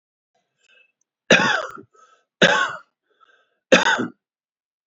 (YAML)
three_cough_length: 4.9 s
three_cough_amplitude: 29150
three_cough_signal_mean_std_ratio: 0.33
survey_phase: beta (2021-08-13 to 2022-03-07)
age: 45-64
gender: Male
wearing_mask: 'No'
symptom_none: true
smoker_status: Ex-smoker
respiratory_condition_asthma: false
respiratory_condition_other: false
recruitment_source: REACT
submission_delay: 2 days
covid_test_result: Negative
covid_test_method: RT-qPCR